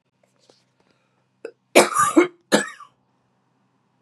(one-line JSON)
{"cough_length": "4.0 s", "cough_amplitude": 32768, "cough_signal_mean_std_ratio": 0.28, "survey_phase": "beta (2021-08-13 to 2022-03-07)", "age": "18-44", "gender": "Female", "wearing_mask": "No", "symptom_cough_any": true, "symptom_runny_or_blocked_nose": true, "symptom_sore_throat": true, "symptom_fatigue": true, "symptom_fever_high_temperature": true, "symptom_headache": true, "symptom_other": true, "symptom_onset": "3 days", "smoker_status": "Ex-smoker", "respiratory_condition_asthma": false, "respiratory_condition_other": false, "recruitment_source": "Test and Trace", "submission_delay": "2 days", "covid_test_result": "Positive", "covid_test_method": "RT-qPCR", "covid_ct_value": 27.5, "covid_ct_gene": "ORF1ab gene", "covid_ct_mean": 27.8, "covid_viral_load": "740 copies/ml", "covid_viral_load_category": "Minimal viral load (< 10K copies/ml)"}